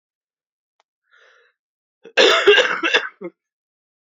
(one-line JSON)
{"three_cough_length": "4.1 s", "three_cough_amplitude": 28371, "three_cough_signal_mean_std_ratio": 0.34, "survey_phase": "beta (2021-08-13 to 2022-03-07)", "age": "18-44", "gender": "Male", "wearing_mask": "No", "symptom_cough_any": true, "symptom_runny_or_blocked_nose": true, "symptom_abdominal_pain": true, "symptom_diarrhoea": true, "symptom_onset": "3 days", "smoker_status": "Ex-smoker", "respiratory_condition_asthma": true, "respiratory_condition_other": true, "recruitment_source": "REACT", "submission_delay": "0 days", "covid_test_result": "Negative", "covid_test_method": "RT-qPCR"}